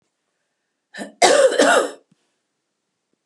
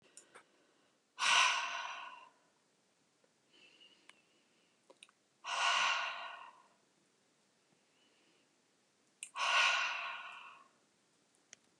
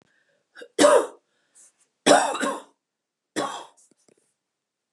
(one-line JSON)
{"cough_length": "3.3 s", "cough_amplitude": 32385, "cough_signal_mean_std_ratio": 0.38, "exhalation_length": "11.8 s", "exhalation_amplitude": 5178, "exhalation_signal_mean_std_ratio": 0.37, "three_cough_length": "4.9 s", "three_cough_amplitude": 23496, "three_cough_signal_mean_std_ratio": 0.31, "survey_phase": "beta (2021-08-13 to 2022-03-07)", "age": "45-64", "gender": "Female", "wearing_mask": "No", "symptom_change_to_sense_of_smell_or_taste": true, "symptom_onset": "12 days", "smoker_status": "Never smoked", "respiratory_condition_asthma": false, "respiratory_condition_other": false, "recruitment_source": "REACT", "submission_delay": "3 days", "covid_test_result": "Negative", "covid_test_method": "RT-qPCR", "influenza_a_test_result": "Negative", "influenza_b_test_result": "Negative"}